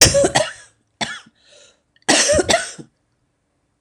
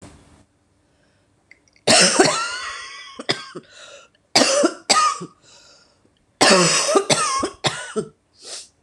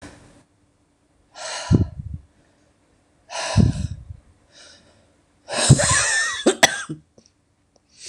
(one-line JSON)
{"cough_length": "3.8 s", "cough_amplitude": 26028, "cough_signal_mean_std_ratio": 0.43, "three_cough_length": "8.8 s", "three_cough_amplitude": 26028, "three_cough_signal_mean_std_ratio": 0.47, "exhalation_length": "8.1 s", "exhalation_amplitude": 26028, "exhalation_signal_mean_std_ratio": 0.37, "survey_phase": "beta (2021-08-13 to 2022-03-07)", "age": "45-64", "gender": "Female", "wearing_mask": "No", "symptom_runny_or_blocked_nose": true, "symptom_sore_throat": true, "symptom_fatigue": true, "symptom_headache": true, "symptom_onset": "2 days", "smoker_status": "Never smoked", "respiratory_condition_asthma": true, "respiratory_condition_other": false, "recruitment_source": "Test and Trace", "submission_delay": "1 day", "covid_test_result": "Positive", "covid_test_method": "RT-qPCR", "covid_ct_value": 20.8, "covid_ct_gene": "ORF1ab gene", "covid_ct_mean": 21.8, "covid_viral_load": "69000 copies/ml", "covid_viral_load_category": "Low viral load (10K-1M copies/ml)"}